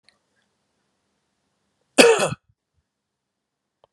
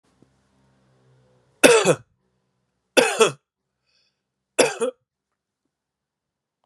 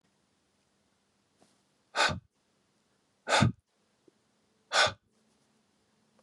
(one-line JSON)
{"cough_length": "3.9 s", "cough_amplitude": 32768, "cough_signal_mean_std_ratio": 0.21, "three_cough_length": "6.7 s", "three_cough_amplitude": 32768, "three_cough_signal_mean_std_ratio": 0.26, "exhalation_length": "6.2 s", "exhalation_amplitude": 9019, "exhalation_signal_mean_std_ratio": 0.25, "survey_phase": "beta (2021-08-13 to 2022-03-07)", "age": "45-64", "gender": "Male", "wearing_mask": "No", "symptom_cough_any": true, "symptom_runny_or_blocked_nose": true, "symptom_onset": "6 days", "smoker_status": "Ex-smoker", "respiratory_condition_asthma": false, "respiratory_condition_other": false, "recruitment_source": "REACT", "submission_delay": "3 days", "covid_test_result": "Negative", "covid_test_method": "RT-qPCR", "influenza_a_test_result": "Unknown/Void", "influenza_b_test_result": "Unknown/Void"}